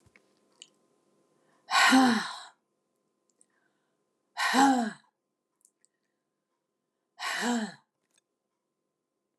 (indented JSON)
{
  "exhalation_length": "9.4 s",
  "exhalation_amplitude": 10308,
  "exhalation_signal_mean_std_ratio": 0.31,
  "survey_phase": "beta (2021-08-13 to 2022-03-07)",
  "age": "65+",
  "gender": "Female",
  "wearing_mask": "No",
  "symptom_none": true,
  "smoker_status": "Never smoked",
  "respiratory_condition_asthma": false,
  "respiratory_condition_other": false,
  "recruitment_source": "REACT",
  "submission_delay": "1 day",
  "covid_test_result": "Negative",
  "covid_test_method": "RT-qPCR",
  "influenza_a_test_result": "Unknown/Void",
  "influenza_b_test_result": "Unknown/Void"
}